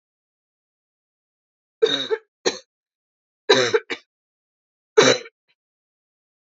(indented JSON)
{
  "three_cough_length": "6.6 s",
  "three_cough_amplitude": 28598,
  "three_cough_signal_mean_std_ratio": 0.26,
  "survey_phase": "alpha (2021-03-01 to 2021-08-12)",
  "age": "18-44",
  "gender": "Female",
  "wearing_mask": "No",
  "symptom_cough_any": true,
  "symptom_headache": true,
  "smoker_status": "Never smoked",
  "respiratory_condition_asthma": false,
  "respiratory_condition_other": false,
  "recruitment_source": "Test and Trace",
  "submission_delay": "2 days",
  "covid_test_result": "Positive",
  "covid_test_method": "RT-qPCR"
}